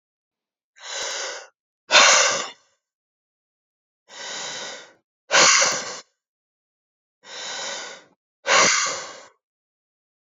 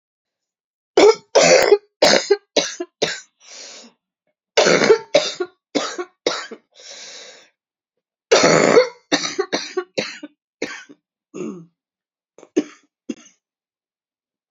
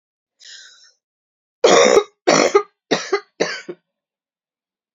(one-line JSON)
{"exhalation_length": "10.3 s", "exhalation_amplitude": 28431, "exhalation_signal_mean_std_ratio": 0.37, "three_cough_length": "14.5 s", "three_cough_amplitude": 32768, "three_cough_signal_mean_std_ratio": 0.37, "cough_length": "4.9 s", "cough_amplitude": 30687, "cough_signal_mean_std_ratio": 0.35, "survey_phase": "beta (2021-08-13 to 2022-03-07)", "age": "45-64", "gender": "Female", "wearing_mask": "No", "symptom_new_continuous_cough": true, "symptom_runny_or_blocked_nose": true, "symptom_shortness_of_breath": true, "symptom_sore_throat": true, "symptom_fatigue": true, "symptom_headache": true, "smoker_status": "Ex-smoker", "respiratory_condition_asthma": false, "respiratory_condition_other": false, "recruitment_source": "Test and Trace", "submission_delay": "2 days", "covid_test_result": "Positive", "covid_test_method": "RT-qPCR", "covid_ct_value": 34.5, "covid_ct_gene": "ORF1ab gene"}